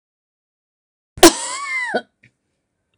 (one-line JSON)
{"cough_length": "3.0 s", "cough_amplitude": 26028, "cough_signal_mean_std_ratio": 0.26, "survey_phase": "alpha (2021-03-01 to 2021-08-12)", "age": "65+", "gender": "Female", "wearing_mask": "No", "symptom_none": true, "smoker_status": "Ex-smoker", "respiratory_condition_asthma": false, "respiratory_condition_other": false, "recruitment_source": "REACT", "submission_delay": "2 days", "covid_test_result": "Negative", "covid_test_method": "RT-qPCR"}